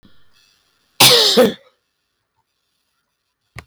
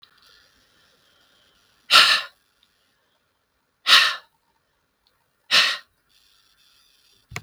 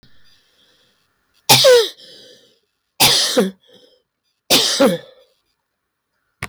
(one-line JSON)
{"cough_length": "3.7 s", "cough_amplitude": 32768, "cough_signal_mean_std_ratio": 0.32, "exhalation_length": "7.4 s", "exhalation_amplitude": 32768, "exhalation_signal_mean_std_ratio": 0.26, "three_cough_length": "6.5 s", "three_cough_amplitude": 32768, "three_cough_signal_mean_std_ratio": 0.38, "survey_phase": "beta (2021-08-13 to 2022-03-07)", "age": "45-64", "gender": "Female", "wearing_mask": "No", "symptom_cough_any": true, "symptom_runny_or_blocked_nose": true, "symptom_shortness_of_breath": true, "symptom_sore_throat": true, "symptom_fatigue": true, "symptom_headache": true, "smoker_status": "Never smoked", "respiratory_condition_asthma": true, "respiratory_condition_other": true, "recruitment_source": "Test and Trace", "submission_delay": "1 day", "covid_test_result": "Positive", "covid_test_method": "RT-qPCR", "covid_ct_value": 24.2, "covid_ct_gene": "ORF1ab gene", "covid_ct_mean": 25.7, "covid_viral_load": "3600 copies/ml", "covid_viral_load_category": "Minimal viral load (< 10K copies/ml)"}